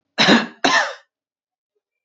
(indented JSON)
{
  "cough_length": "2.0 s",
  "cough_amplitude": 27563,
  "cough_signal_mean_std_ratio": 0.41,
  "survey_phase": "beta (2021-08-13 to 2022-03-07)",
  "age": "18-44",
  "gender": "Female",
  "wearing_mask": "No",
  "symptom_none": true,
  "smoker_status": "Never smoked",
  "respiratory_condition_asthma": false,
  "respiratory_condition_other": false,
  "recruitment_source": "REACT",
  "submission_delay": "1 day",
  "covid_test_result": "Negative",
  "covid_test_method": "RT-qPCR",
  "influenza_a_test_result": "Negative",
  "influenza_b_test_result": "Negative"
}